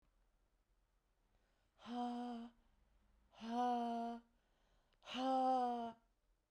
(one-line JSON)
{"exhalation_length": "6.5 s", "exhalation_amplitude": 1117, "exhalation_signal_mean_std_ratio": 0.49, "survey_phase": "beta (2021-08-13 to 2022-03-07)", "age": "45-64", "gender": "Female", "wearing_mask": "No", "symptom_none": true, "smoker_status": "Current smoker (11 or more cigarettes per day)", "respiratory_condition_asthma": false, "respiratory_condition_other": false, "recruitment_source": "REACT", "submission_delay": "1 day", "covid_test_result": "Negative", "covid_test_method": "RT-qPCR", "influenza_a_test_result": "Negative", "influenza_b_test_result": "Negative"}